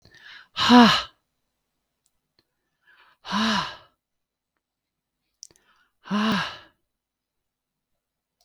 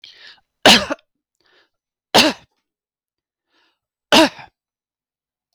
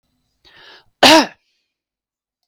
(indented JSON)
{
  "exhalation_length": "8.4 s",
  "exhalation_amplitude": 28379,
  "exhalation_signal_mean_std_ratio": 0.27,
  "three_cough_length": "5.5 s",
  "three_cough_amplitude": 32768,
  "three_cough_signal_mean_std_ratio": 0.25,
  "cough_length": "2.5 s",
  "cough_amplitude": 32768,
  "cough_signal_mean_std_ratio": 0.26,
  "survey_phase": "beta (2021-08-13 to 2022-03-07)",
  "age": "45-64",
  "gender": "Female",
  "wearing_mask": "No",
  "symptom_none": true,
  "smoker_status": "Never smoked",
  "respiratory_condition_asthma": false,
  "respiratory_condition_other": false,
  "recruitment_source": "REACT",
  "submission_delay": "2 days",
  "covid_test_result": "Negative",
  "covid_test_method": "RT-qPCR",
  "influenza_a_test_result": "Negative",
  "influenza_b_test_result": "Negative"
}